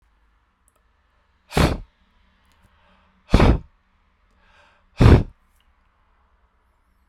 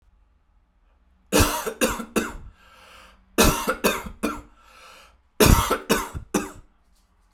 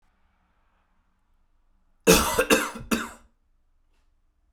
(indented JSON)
{
  "exhalation_length": "7.1 s",
  "exhalation_amplitude": 32768,
  "exhalation_signal_mean_std_ratio": 0.24,
  "three_cough_length": "7.3 s",
  "three_cough_amplitude": 29053,
  "three_cough_signal_mean_std_ratio": 0.4,
  "cough_length": "4.5 s",
  "cough_amplitude": 25686,
  "cough_signal_mean_std_ratio": 0.29,
  "survey_phase": "beta (2021-08-13 to 2022-03-07)",
  "age": "45-64",
  "gender": "Male",
  "wearing_mask": "No",
  "symptom_none": true,
  "smoker_status": "Never smoked",
  "respiratory_condition_asthma": false,
  "respiratory_condition_other": false,
  "recruitment_source": "REACT",
  "submission_delay": "3 days",
  "covid_test_result": "Negative",
  "covid_test_method": "RT-qPCR"
}